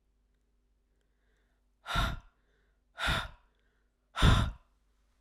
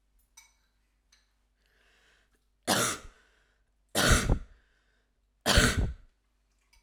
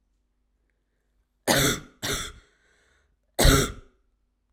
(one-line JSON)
{"exhalation_length": "5.2 s", "exhalation_amplitude": 9367, "exhalation_signal_mean_std_ratio": 0.31, "three_cough_length": "6.8 s", "three_cough_amplitude": 12982, "three_cough_signal_mean_std_ratio": 0.33, "cough_length": "4.5 s", "cough_amplitude": 21384, "cough_signal_mean_std_ratio": 0.33, "survey_phase": "alpha (2021-03-01 to 2021-08-12)", "age": "18-44", "gender": "Female", "wearing_mask": "No", "symptom_shortness_of_breath": true, "symptom_fatigue": true, "symptom_fever_high_temperature": true, "symptom_headache": true, "smoker_status": "Never smoked", "respiratory_condition_asthma": false, "respiratory_condition_other": false, "recruitment_source": "Test and Trace", "submission_delay": "2 days", "covid_test_result": "Positive", "covid_test_method": "RT-qPCR"}